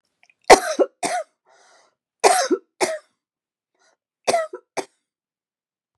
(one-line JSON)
{"three_cough_length": "6.0 s", "three_cough_amplitude": 32768, "three_cough_signal_mean_std_ratio": 0.28, "survey_phase": "beta (2021-08-13 to 2022-03-07)", "age": "65+", "gender": "Female", "wearing_mask": "No", "symptom_cough_any": true, "smoker_status": "Ex-smoker", "respiratory_condition_asthma": false, "respiratory_condition_other": false, "recruitment_source": "REACT", "submission_delay": "4 days", "covid_test_result": "Negative", "covid_test_method": "RT-qPCR", "influenza_a_test_result": "Negative", "influenza_b_test_result": "Negative"}